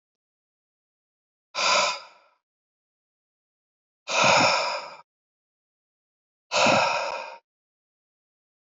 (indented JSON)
{
  "exhalation_length": "8.7 s",
  "exhalation_amplitude": 20647,
  "exhalation_signal_mean_std_ratio": 0.36,
  "survey_phase": "beta (2021-08-13 to 2022-03-07)",
  "age": "18-44",
  "gender": "Male",
  "wearing_mask": "No",
  "symptom_cough_any": true,
  "symptom_runny_or_blocked_nose": true,
  "symptom_fatigue": true,
  "symptom_fever_high_temperature": true,
  "symptom_headache": true,
  "symptom_other": true,
  "smoker_status": "Never smoked",
  "respiratory_condition_asthma": false,
  "respiratory_condition_other": false,
  "recruitment_source": "Test and Trace",
  "submission_delay": "1 day",
  "covid_test_result": "Positive",
  "covid_test_method": "LAMP"
}